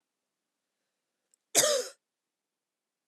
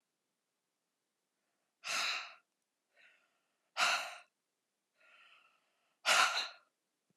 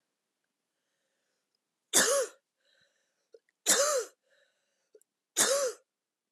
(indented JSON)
{
  "cough_length": "3.1 s",
  "cough_amplitude": 13675,
  "cough_signal_mean_std_ratio": 0.24,
  "exhalation_length": "7.2 s",
  "exhalation_amplitude": 5892,
  "exhalation_signal_mean_std_ratio": 0.3,
  "three_cough_length": "6.3 s",
  "three_cough_amplitude": 12831,
  "three_cough_signal_mean_std_ratio": 0.33,
  "survey_phase": "beta (2021-08-13 to 2022-03-07)",
  "age": "18-44",
  "gender": "Female",
  "wearing_mask": "No",
  "symptom_cough_any": true,
  "symptom_runny_or_blocked_nose": true,
  "symptom_shortness_of_breath": true,
  "symptom_sore_throat": true,
  "symptom_fatigue": true,
  "symptom_fever_high_temperature": true,
  "symptom_headache": true,
  "symptom_change_to_sense_of_smell_or_taste": true,
  "symptom_onset": "8 days",
  "smoker_status": "Never smoked",
  "respiratory_condition_asthma": false,
  "respiratory_condition_other": false,
  "recruitment_source": "Test and Trace",
  "submission_delay": "2 days",
  "covid_test_result": "Positive",
  "covid_test_method": "RT-qPCR",
  "covid_ct_value": 17.3,
  "covid_ct_gene": "ORF1ab gene"
}